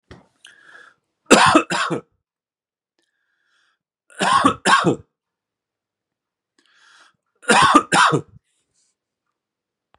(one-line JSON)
{"three_cough_length": "10.0 s", "three_cough_amplitude": 32768, "three_cough_signal_mean_std_ratio": 0.33, "survey_phase": "beta (2021-08-13 to 2022-03-07)", "age": "45-64", "gender": "Male", "wearing_mask": "No", "symptom_none": true, "smoker_status": "Ex-smoker", "respiratory_condition_asthma": false, "respiratory_condition_other": false, "recruitment_source": "REACT", "submission_delay": "1 day", "covid_test_result": "Negative", "covid_test_method": "RT-qPCR", "influenza_a_test_result": "Unknown/Void", "influenza_b_test_result": "Unknown/Void"}